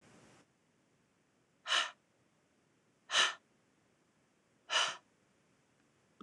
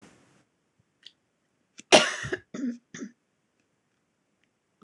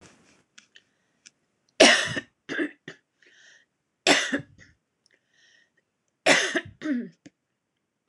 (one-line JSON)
{"exhalation_length": "6.2 s", "exhalation_amplitude": 5347, "exhalation_signal_mean_std_ratio": 0.27, "cough_length": "4.8 s", "cough_amplitude": 23675, "cough_signal_mean_std_ratio": 0.21, "three_cough_length": "8.1 s", "three_cough_amplitude": 26027, "three_cough_signal_mean_std_ratio": 0.29, "survey_phase": "beta (2021-08-13 to 2022-03-07)", "age": "45-64", "gender": "Female", "wearing_mask": "No", "symptom_cough_any": true, "symptom_runny_or_blocked_nose": true, "symptom_sore_throat": true, "symptom_diarrhoea": true, "symptom_onset": "8 days", "smoker_status": "Never smoked", "respiratory_condition_asthma": true, "respiratory_condition_other": true, "recruitment_source": "REACT", "submission_delay": "2 days", "covid_test_result": "Negative", "covid_test_method": "RT-qPCR", "influenza_a_test_result": "Negative", "influenza_b_test_result": "Negative"}